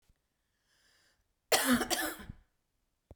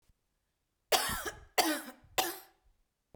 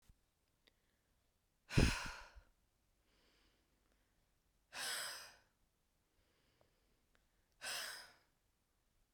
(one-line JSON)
{"cough_length": "3.2 s", "cough_amplitude": 12440, "cough_signal_mean_std_ratio": 0.34, "three_cough_length": "3.2 s", "three_cough_amplitude": 10411, "three_cough_signal_mean_std_ratio": 0.38, "exhalation_length": "9.1 s", "exhalation_amplitude": 3351, "exhalation_signal_mean_std_ratio": 0.24, "survey_phase": "beta (2021-08-13 to 2022-03-07)", "age": "18-44", "gender": "Female", "wearing_mask": "No", "symptom_cough_any": true, "symptom_new_continuous_cough": true, "symptom_runny_or_blocked_nose": true, "symptom_sore_throat": true, "symptom_abdominal_pain": true, "symptom_fatigue": true, "symptom_headache": true, "symptom_onset": "3 days", "smoker_status": "Ex-smoker", "respiratory_condition_asthma": true, "respiratory_condition_other": false, "recruitment_source": "Test and Trace", "submission_delay": "1 day", "covid_test_result": "Positive", "covid_test_method": "RT-qPCR", "covid_ct_value": 31.7, "covid_ct_gene": "N gene", "covid_ct_mean": 31.9, "covid_viral_load": "34 copies/ml", "covid_viral_load_category": "Minimal viral load (< 10K copies/ml)"}